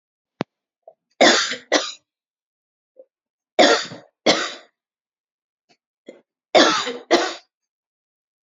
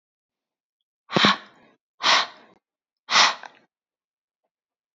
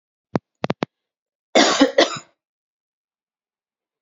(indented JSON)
{
  "three_cough_length": "8.4 s",
  "three_cough_amplitude": 30744,
  "three_cough_signal_mean_std_ratio": 0.32,
  "exhalation_length": "4.9 s",
  "exhalation_amplitude": 27304,
  "exhalation_signal_mean_std_ratio": 0.29,
  "cough_length": "4.0 s",
  "cough_amplitude": 31190,
  "cough_signal_mean_std_ratio": 0.28,
  "survey_phase": "beta (2021-08-13 to 2022-03-07)",
  "age": "18-44",
  "gender": "Female",
  "wearing_mask": "No",
  "symptom_cough_any": true,
  "symptom_runny_or_blocked_nose": true,
  "symptom_headache": true,
  "symptom_onset": "5 days",
  "smoker_status": "Never smoked",
  "respiratory_condition_asthma": false,
  "respiratory_condition_other": false,
  "recruitment_source": "REACT",
  "submission_delay": "3 days",
  "covid_test_result": "Negative",
  "covid_test_method": "RT-qPCR"
}